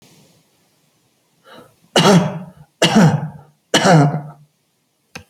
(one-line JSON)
{"three_cough_length": "5.3 s", "three_cough_amplitude": 32639, "three_cough_signal_mean_std_ratio": 0.42, "survey_phase": "alpha (2021-03-01 to 2021-08-12)", "age": "65+", "gender": "Male", "wearing_mask": "No", "symptom_none": true, "symptom_onset": "12 days", "smoker_status": "Never smoked", "respiratory_condition_asthma": false, "respiratory_condition_other": false, "recruitment_source": "REACT", "submission_delay": "1 day", "covid_test_result": "Negative", "covid_test_method": "RT-qPCR"}